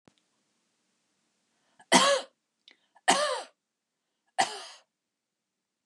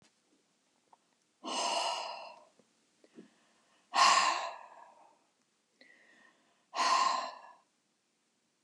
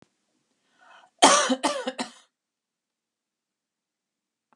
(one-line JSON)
{"three_cough_length": "5.9 s", "three_cough_amplitude": 20790, "three_cough_signal_mean_std_ratio": 0.27, "exhalation_length": "8.6 s", "exhalation_amplitude": 7699, "exhalation_signal_mean_std_ratio": 0.36, "cough_length": "4.6 s", "cough_amplitude": 28303, "cough_signal_mean_std_ratio": 0.25, "survey_phase": "beta (2021-08-13 to 2022-03-07)", "age": "65+", "gender": "Female", "wearing_mask": "No", "symptom_none": true, "smoker_status": "Never smoked", "respiratory_condition_asthma": false, "respiratory_condition_other": false, "recruitment_source": "REACT", "submission_delay": "2 days", "covid_test_result": "Negative", "covid_test_method": "RT-qPCR", "influenza_a_test_result": "Negative", "influenza_b_test_result": "Negative"}